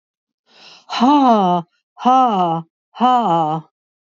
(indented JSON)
{
  "exhalation_length": "4.2 s",
  "exhalation_amplitude": 26578,
  "exhalation_signal_mean_std_ratio": 0.57,
  "survey_phase": "beta (2021-08-13 to 2022-03-07)",
  "age": "65+",
  "gender": "Female",
  "wearing_mask": "No",
  "symptom_none": true,
  "symptom_onset": "5 days",
  "smoker_status": "Ex-smoker",
  "respiratory_condition_asthma": false,
  "respiratory_condition_other": false,
  "recruitment_source": "Test and Trace",
  "submission_delay": "1 day",
  "covid_test_result": "Positive",
  "covid_test_method": "RT-qPCR",
  "covid_ct_value": 23.6,
  "covid_ct_gene": "N gene",
  "covid_ct_mean": 23.7,
  "covid_viral_load": "17000 copies/ml",
  "covid_viral_load_category": "Low viral load (10K-1M copies/ml)"
}